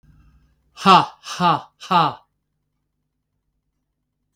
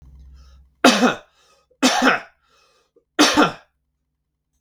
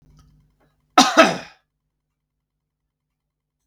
{"exhalation_length": "4.4 s", "exhalation_amplitude": 32768, "exhalation_signal_mean_std_ratio": 0.3, "three_cough_length": "4.6 s", "three_cough_amplitude": 32768, "three_cough_signal_mean_std_ratio": 0.37, "cough_length": "3.7 s", "cough_amplitude": 32768, "cough_signal_mean_std_ratio": 0.22, "survey_phase": "beta (2021-08-13 to 2022-03-07)", "age": "45-64", "gender": "Male", "wearing_mask": "No", "symptom_none": true, "smoker_status": "Never smoked", "respiratory_condition_asthma": false, "respiratory_condition_other": false, "recruitment_source": "REACT", "submission_delay": "4 days", "covid_test_result": "Negative", "covid_test_method": "RT-qPCR"}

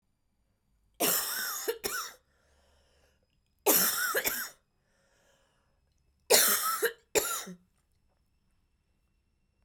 {"three_cough_length": "9.6 s", "three_cough_amplitude": 15912, "three_cough_signal_mean_std_ratio": 0.39, "survey_phase": "beta (2021-08-13 to 2022-03-07)", "age": "18-44", "gender": "Female", "wearing_mask": "No", "symptom_runny_or_blocked_nose": true, "symptom_sore_throat": true, "symptom_diarrhoea": true, "symptom_fatigue": true, "symptom_other": true, "symptom_onset": "5 days", "smoker_status": "Never smoked", "respiratory_condition_asthma": true, "respiratory_condition_other": false, "recruitment_source": "Test and Trace", "submission_delay": "1 day", "covid_test_result": "Positive", "covid_test_method": "RT-qPCR", "covid_ct_value": 20.8, "covid_ct_gene": "N gene"}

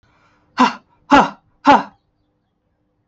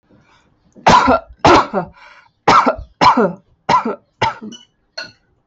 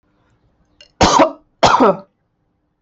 {"exhalation_length": "3.1 s", "exhalation_amplitude": 28688, "exhalation_signal_mean_std_ratio": 0.31, "three_cough_length": "5.5 s", "three_cough_amplitude": 29500, "three_cough_signal_mean_std_ratio": 0.46, "cough_length": "2.8 s", "cough_amplitude": 28865, "cough_signal_mean_std_ratio": 0.39, "survey_phase": "beta (2021-08-13 to 2022-03-07)", "age": "18-44", "gender": "Female", "wearing_mask": "No", "symptom_headache": true, "smoker_status": "Never smoked", "respiratory_condition_asthma": true, "respiratory_condition_other": false, "recruitment_source": "REACT", "submission_delay": "1 day", "covid_test_result": "Negative", "covid_test_method": "RT-qPCR"}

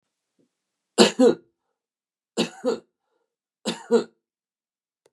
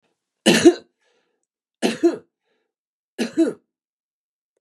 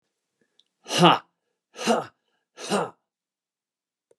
{"three_cough_length": "5.1 s", "three_cough_amplitude": 29227, "three_cough_signal_mean_std_ratio": 0.27, "cough_length": "4.6 s", "cough_amplitude": 30921, "cough_signal_mean_std_ratio": 0.29, "exhalation_length": "4.2 s", "exhalation_amplitude": 31280, "exhalation_signal_mean_std_ratio": 0.29, "survey_phase": "beta (2021-08-13 to 2022-03-07)", "age": "65+", "gender": "Male", "wearing_mask": "No", "symptom_none": true, "smoker_status": "Never smoked", "respiratory_condition_asthma": false, "respiratory_condition_other": false, "recruitment_source": "Test and Trace", "submission_delay": "1 day", "covid_test_result": "Negative", "covid_test_method": "RT-qPCR"}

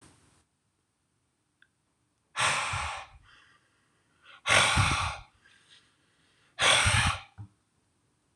{"exhalation_length": "8.4 s", "exhalation_amplitude": 11815, "exhalation_signal_mean_std_ratio": 0.38, "survey_phase": "beta (2021-08-13 to 2022-03-07)", "age": "45-64", "gender": "Male", "wearing_mask": "No", "symptom_fatigue": true, "symptom_onset": "9 days", "smoker_status": "Ex-smoker", "respiratory_condition_asthma": false, "respiratory_condition_other": false, "recruitment_source": "REACT", "submission_delay": "2 days", "covid_test_result": "Negative", "covid_test_method": "RT-qPCR", "influenza_a_test_result": "Unknown/Void", "influenza_b_test_result": "Unknown/Void"}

